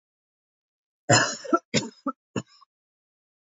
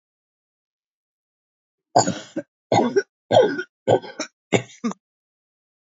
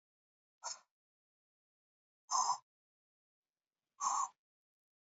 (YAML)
cough_length: 3.6 s
cough_amplitude: 17863
cough_signal_mean_std_ratio: 0.28
three_cough_length: 5.8 s
three_cough_amplitude: 26656
three_cough_signal_mean_std_ratio: 0.33
exhalation_length: 5.0 s
exhalation_amplitude: 2927
exhalation_signal_mean_std_ratio: 0.27
survey_phase: alpha (2021-03-01 to 2021-08-12)
age: 18-44
gender: Female
wearing_mask: 'No'
symptom_cough_any: true
symptom_new_continuous_cough: true
symptom_shortness_of_breath: true
symptom_fatigue: true
symptom_headache: true
symptom_onset: 4 days
smoker_status: Never smoked
respiratory_condition_asthma: false
respiratory_condition_other: false
recruitment_source: Test and Trace
submission_delay: 2 days
covid_test_result: Positive
covid_test_method: LAMP